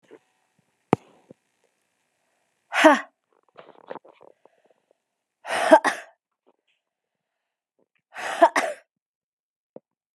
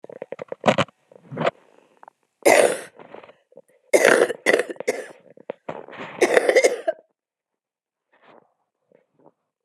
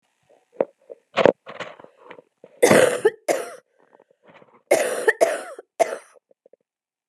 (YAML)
exhalation_length: 10.2 s
exhalation_amplitude: 31064
exhalation_signal_mean_std_ratio: 0.22
three_cough_length: 9.6 s
three_cough_amplitude: 32767
three_cough_signal_mean_std_ratio: 0.34
cough_length: 7.1 s
cough_amplitude: 32768
cough_signal_mean_std_ratio: 0.33
survey_phase: beta (2021-08-13 to 2022-03-07)
age: 18-44
gender: Female
wearing_mask: 'No'
symptom_cough_any: true
symptom_runny_or_blocked_nose: true
symptom_sore_throat: true
symptom_abdominal_pain: true
symptom_fatigue: true
symptom_headache: true
symptom_change_to_sense_of_smell_or_taste: true
symptom_onset: 4 days
smoker_status: Never smoked
respiratory_condition_asthma: false
respiratory_condition_other: false
recruitment_source: Test and Trace
submission_delay: 1 day
covid_test_result: Positive
covid_test_method: RT-qPCR
covid_ct_value: 16.0
covid_ct_gene: ORF1ab gene
covid_ct_mean: 16.5
covid_viral_load: 4000000 copies/ml
covid_viral_load_category: High viral load (>1M copies/ml)